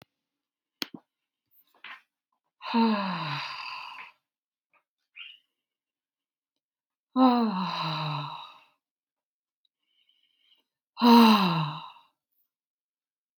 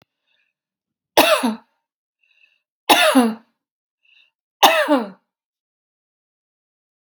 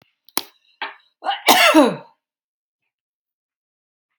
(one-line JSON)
{"exhalation_length": "13.4 s", "exhalation_amplitude": 18300, "exhalation_signal_mean_std_ratio": 0.33, "three_cough_length": "7.2 s", "three_cough_amplitude": 32768, "three_cough_signal_mean_std_ratio": 0.31, "cough_length": "4.2 s", "cough_amplitude": 32768, "cough_signal_mean_std_ratio": 0.3, "survey_phase": "beta (2021-08-13 to 2022-03-07)", "age": "65+", "gender": "Female", "wearing_mask": "No", "symptom_none": true, "smoker_status": "Ex-smoker", "respiratory_condition_asthma": false, "respiratory_condition_other": false, "recruitment_source": "REACT", "submission_delay": "2 days", "covid_test_result": "Negative", "covid_test_method": "RT-qPCR", "influenza_a_test_result": "Negative", "influenza_b_test_result": "Negative"}